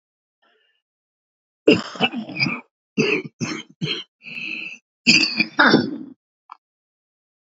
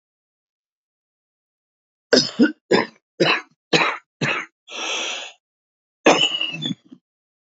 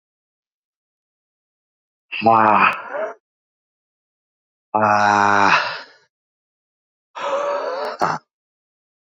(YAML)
cough_length: 7.6 s
cough_amplitude: 29560
cough_signal_mean_std_ratio: 0.38
three_cough_length: 7.5 s
three_cough_amplitude: 29281
three_cough_signal_mean_std_ratio: 0.38
exhalation_length: 9.1 s
exhalation_amplitude: 28273
exhalation_signal_mean_std_ratio: 0.4
survey_phase: beta (2021-08-13 to 2022-03-07)
age: 45-64
gender: Male
wearing_mask: 'No'
symptom_cough_any: true
symptom_runny_or_blocked_nose: true
symptom_fatigue: true
symptom_onset: 3 days
smoker_status: Current smoker (11 or more cigarettes per day)
respiratory_condition_asthma: false
respiratory_condition_other: false
recruitment_source: Test and Trace
submission_delay: 2 days
covid_test_result: Positive
covid_test_method: RT-qPCR
covid_ct_value: 34.8
covid_ct_gene: ORF1ab gene
covid_ct_mean: 35.7
covid_viral_load: 2 copies/ml
covid_viral_load_category: Minimal viral load (< 10K copies/ml)